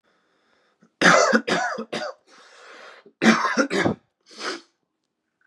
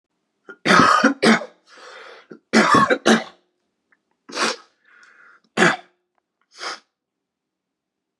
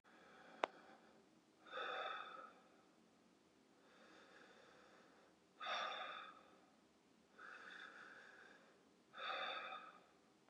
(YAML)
cough_length: 5.5 s
cough_amplitude: 28334
cough_signal_mean_std_ratio: 0.42
three_cough_length: 8.2 s
three_cough_amplitude: 32432
three_cough_signal_mean_std_ratio: 0.37
exhalation_length: 10.5 s
exhalation_amplitude: 3153
exhalation_signal_mean_std_ratio: 0.51
survey_phase: beta (2021-08-13 to 2022-03-07)
age: 18-44
gender: Male
wearing_mask: 'No'
symptom_cough_any: true
symptom_new_continuous_cough: true
symptom_sore_throat: true
symptom_fatigue: true
smoker_status: Prefer not to say
respiratory_condition_asthma: false
respiratory_condition_other: false
recruitment_source: REACT
submission_delay: 2 days
covid_test_result: Negative
covid_test_method: RT-qPCR
influenza_a_test_result: Negative
influenza_b_test_result: Negative